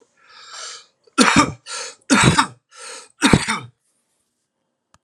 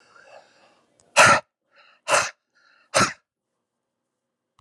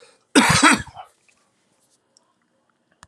{"three_cough_length": "5.0 s", "three_cough_amplitude": 32768, "three_cough_signal_mean_std_ratio": 0.38, "exhalation_length": "4.6 s", "exhalation_amplitude": 29078, "exhalation_signal_mean_std_ratio": 0.27, "cough_length": "3.1 s", "cough_amplitude": 31137, "cough_signal_mean_std_ratio": 0.31, "survey_phase": "alpha (2021-03-01 to 2021-08-12)", "age": "45-64", "gender": "Male", "wearing_mask": "No", "symptom_none": true, "smoker_status": "Ex-smoker", "respiratory_condition_asthma": false, "respiratory_condition_other": false, "recruitment_source": "REACT", "submission_delay": "2 days", "covid_test_result": "Negative", "covid_test_method": "RT-qPCR"}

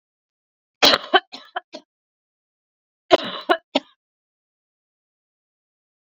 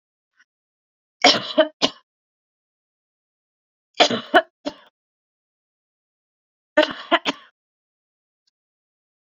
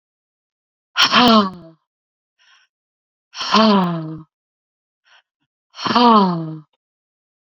{"cough_length": "6.1 s", "cough_amplitude": 31326, "cough_signal_mean_std_ratio": 0.21, "three_cough_length": "9.3 s", "three_cough_amplitude": 32767, "three_cough_signal_mean_std_ratio": 0.22, "exhalation_length": "7.5 s", "exhalation_amplitude": 32767, "exhalation_signal_mean_std_ratio": 0.39, "survey_phase": "beta (2021-08-13 to 2022-03-07)", "age": "45-64", "gender": "Female", "wearing_mask": "No", "symptom_cough_any": true, "symptom_runny_or_blocked_nose": true, "symptom_sore_throat": true, "symptom_fatigue": true, "symptom_headache": true, "symptom_onset": "4 days", "smoker_status": "Never smoked", "respiratory_condition_asthma": false, "respiratory_condition_other": false, "recruitment_source": "Test and Trace", "submission_delay": "2 days", "covid_test_result": "Positive", "covid_test_method": "RT-qPCR", "covid_ct_value": 15.8, "covid_ct_gene": "ORF1ab gene", "covid_ct_mean": 16.3, "covid_viral_load": "4600000 copies/ml", "covid_viral_load_category": "High viral load (>1M copies/ml)"}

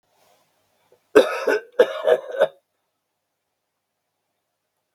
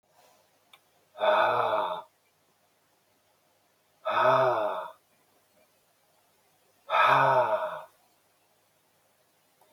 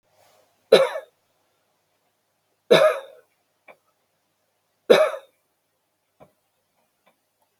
{"cough_length": "4.9 s", "cough_amplitude": 32768, "cough_signal_mean_std_ratio": 0.28, "exhalation_length": "9.7 s", "exhalation_amplitude": 13120, "exhalation_signal_mean_std_ratio": 0.42, "three_cough_length": "7.6 s", "three_cough_amplitude": 32653, "three_cough_signal_mean_std_ratio": 0.23, "survey_phase": "beta (2021-08-13 to 2022-03-07)", "age": "65+", "gender": "Male", "wearing_mask": "No", "symptom_cough_any": true, "symptom_sore_throat": true, "symptom_headache": true, "symptom_onset": "5 days", "smoker_status": "Never smoked", "respiratory_condition_asthma": false, "respiratory_condition_other": false, "recruitment_source": "REACT", "submission_delay": "0 days", "covid_test_result": "Negative", "covid_test_method": "RT-qPCR", "influenza_a_test_result": "Negative", "influenza_b_test_result": "Negative"}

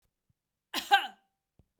{"cough_length": "1.8 s", "cough_amplitude": 14659, "cough_signal_mean_std_ratio": 0.24, "survey_phase": "beta (2021-08-13 to 2022-03-07)", "age": "45-64", "gender": "Female", "wearing_mask": "No", "symptom_none": true, "smoker_status": "Ex-smoker", "respiratory_condition_asthma": false, "respiratory_condition_other": false, "recruitment_source": "Test and Trace", "submission_delay": "1 day", "covid_test_result": "Negative", "covid_test_method": "RT-qPCR"}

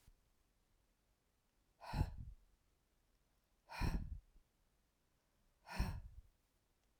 {"exhalation_length": "7.0 s", "exhalation_amplitude": 1827, "exhalation_signal_mean_std_ratio": 0.32, "survey_phase": "alpha (2021-03-01 to 2021-08-12)", "age": "45-64", "gender": "Female", "wearing_mask": "No", "symptom_none": true, "smoker_status": "Never smoked", "respiratory_condition_asthma": false, "respiratory_condition_other": false, "recruitment_source": "REACT", "submission_delay": "1 day", "covid_test_result": "Negative", "covid_test_method": "RT-qPCR"}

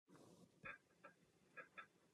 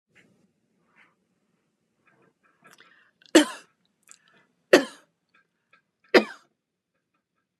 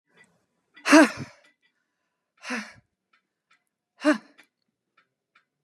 {"cough_length": "2.1 s", "cough_amplitude": 270, "cough_signal_mean_std_ratio": 0.53, "three_cough_length": "7.6 s", "three_cough_amplitude": 30317, "three_cough_signal_mean_std_ratio": 0.15, "exhalation_length": "5.6 s", "exhalation_amplitude": 27155, "exhalation_signal_mean_std_ratio": 0.21, "survey_phase": "beta (2021-08-13 to 2022-03-07)", "age": "65+", "gender": "Female", "wearing_mask": "No", "symptom_none": true, "smoker_status": "Never smoked", "respiratory_condition_asthma": false, "respiratory_condition_other": false, "recruitment_source": "REACT", "submission_delay": "1 day", "covid_test_result": "Negative", "covid_test_method": "RT-qPCR"}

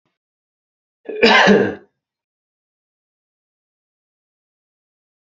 {"cough_length": "5.4 s", "cough_amplitude": 29681, "cough_signal_mean_std_ratio": 0.26, "survey_phase": "beta (2021-08-13 to 2022-03-07)", "age": "45-64", "gender": "Male", "wearing_mask": "No", "symptom_none": true, "smoker_status": "Ex-smoker", "respiratory_condition_asthma": false, "respiratory_condition_other": false, "recruitment_source": "REACT", "submission_delay": "5 days", "covid_test_result": "Negative", "covid_test_method": "RT-qPCR"}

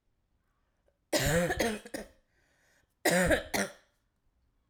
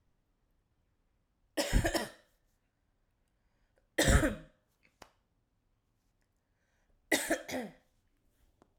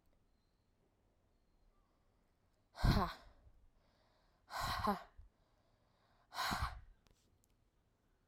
{"cough_length": "4.7 s", "cough_amplitude": 8038, "cough_signal_mean_std_ratio": 0.42, "three_cough_length": "8.8 s", "three_cough_amplitude": 8176, "three_cough_signal_mean_std_ratio": 0.28, "exhalation_length": "8.3 s", "exhalation_amplitude": 3431, "exhalation_signal_mean_std_ratio": 0.3, "survey_phase": "alpha (2021-03-01 to 2021-08-12)", "age": "18-44", "gender": "Female", "wearing_mask": "No", "symptom_cough_any": true, "symptom_new_continuous_cough": true, "symptom_diarrhoea": true, "symptom_fatigue": true, "symptom_fever_high_temperature": true, "symptom_headache": true, "symptom_change_to_sense_of_smell_or_taste": true, "symptom_loss_of_taste": true, "symptom_onset": "3 days", "smoker_status": "Never smoked", "respiratory_condition_asthma": false, "respiratory_condition_other": false, "recruitment_source": "Test and Trace", "submission_delay": "1 day", "covid_test_result": "Positive", "covid_test_method": "RT-qPCR", "covid_ct_value": 17.2, "covid_ct_gene": "ORF1ab gene", "covid_ct_mean": 17.7, "covid_viral_load": "1600000 copies/ml", "covid_viral_load_category": "High viral load (>1M copies/ml)"}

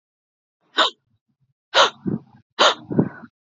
{"exhalation_length": "3.4 s", "exhalation_amplitude": 31622, "exhalation_signal_mean_std_ratio": 0.34, "survey_phase": "alpha (2021-03-01 to 2021-08-12)", "age": "18-44", "gender": "Female", "wearing_mask": "No", "symptom_none": true, "smoker_status": "Never smoked", "respiratory_condition_asthma": false, "respiratory_condition_other": false, "recruitment_source": "REACT", "submission_delay": "3 days", "covid_test_result": "Negative", "covid_test_method": "RT-qPCR"}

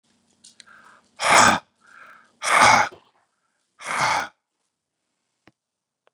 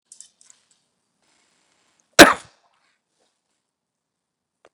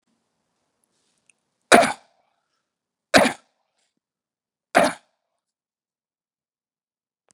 {"exhalation_length": "6.1 s", "exhalation_amplitude": 29675, "exhalation_signal_mean_std_ratio": 0.33, "cough_length": "4.7 s", "cough_amplitude": 32768, "cough_signal_mean_std_ratio": 0.12, "three_cough_length": "7.3 s", "three_cough_amplitude": 32768, "three_cough_signal_mean_std_ratio": 0.19, "survey_phase": "beta (2021-08-13 to 2022-03-07)", "age": "45-64", "gender": "Male", "wearing_mask": "No", "symptom_cough_any": true, "symptom_runny_or_blocked_nose": true, "symptom_fatigue": true, "symptom_headache": true, "symptom_change_to_sense_of_smell_or_taste": true, "symptom_loss_of_taste": true, "symptom_onset": "4 days", "smoker_status": "Ex-smoker", "respiratory_condition_asthma": false, "respiratory_condition_other": false, "recruitment_source": "Test and Trace", "submission_delay": "1 day", "covid_test_result": "Positive", "covid_test_method": "RT-qPCR", "covid_ct_value": 21.3, "covid_ct_gene": "ORF1ab gene"}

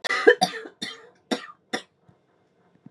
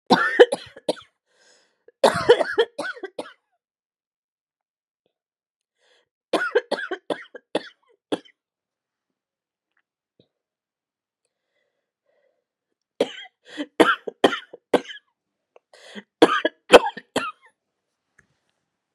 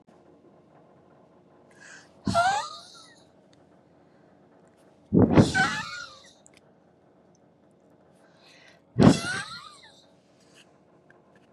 {"cough_length": "2.9 s", "cough_amplitude": 28841, "cough_signal_mean_std_ratio": 0.3, "three_cough_length": "18.9 s", "three_cough_amplitude": 32768, "three_cough_signal_mean_std_ratio": 0.23, "exhalation_length": "11.5 s", "exhalation_amplitude": 21009, "exhalation_signal_mean_std_ratio": 0.28, "survey_phase": "beta (2021-08-13 to 2022-03-07)", "age": "45-64", "gender": "Female", "wearing_mask": "No", "symptom_cough_any": true, "symptom_runny_or_blocked_nose": true, "symptom_shortness_of_breath": true, "symptom_sore_throat": true, "symptom_abdominal_pain": true, "symptom_diarrhoea": true, "symptom_fatigue": true, "smoker_status": "Never smoked", "respiratory_condition_asthma": true, "respiratory_condition_other": false, "recruitment_source": "REACT", "submission_delay": "1 day", "covid_test_result": "Negative", "covid_test_method": "RT-qPCR", "influenza_a_test_result": "Negative", "influenza_b_test_result": "Negative"}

